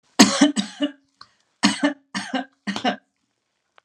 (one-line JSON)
{"three_cough_length": "3.8 s", "three_cough_amplitude": 32768, "three_cough_signal_mean_std_ratio": 0.38, "survey_phase": "alpha (2021-03-01 to 2021-08-12)", "age": "45-64", "gender": "Female", "wearing_mask": "No", "symptom_none": true, "smoker_status": "Ex-smoker", "respiratory_condition_asthma": false, "respiratory_condition_other": false, "recruitment_source": "REACT", "submission_delay": "5 days", "covid_test_result": "Negative", "covid_test_method": "RT-qPCR"}